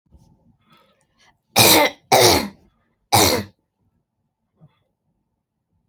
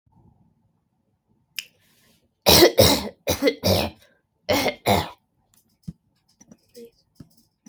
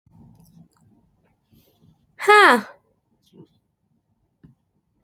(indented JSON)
{
  "cough_length": "5.9 s",
  "cough_amplitude": 32767,
  "cough_signal_mean_std_ratio": 0.33,
  "three_cough_length": "7.7 s",
  "three_cough_amplitude": 29550,
  "three_cough_signal_mean_std_ratio": 0.33,
  "exhalation_length": "5.0 s",
  "exhalation_amplitude": 28562,
  "exhalation_signal_mean_std_ratio": 0.21,
  "survey_phase": "alpha (2021-03-01 to 2021-08-12)",
  "age": "18-44",
  "gender": "Female",
  "wearing_mask": "No",
  "symptom_none": true,
  "smoker_status": "Never smoked",
  "respiratory_condition_asthma": false,
  "respiratory_condition_other": false,
  "recruitment_source": "Test and Trace",
  "submission_delay": "1 day",
  "covid_test_result": "Positive",
  "covid_test_method": "LFT"
}